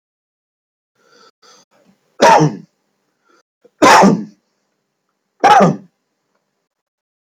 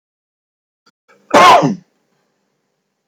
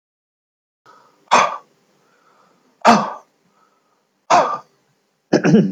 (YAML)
three_cough_length: 7.3 s
three_cough_amplitude: 32767
three_cough_signal_mean_std_ratio: 0.32
cough_length: 3.1 s
cough_amplitude: 32768
cough_signal_mean_std_ratio: 0.31
exhalation_length: 5.7 s
exhalation_amplitude: 31706
exhalation_signal_mean_std_ratio: 0.34
survey_phase: beta (2021-08-13 to 2022-03-07)
age: 65+
gender: Male
wearing_mask: 'No'
symptom_none: true
smoker_status: Never smoked
respiratory_condition_asthma: false
respiratory_condition_other: false
recruitment_source: Test and Trace
submission_delay: 0 days
covid_test_result: Negative
covid_test_method: LFT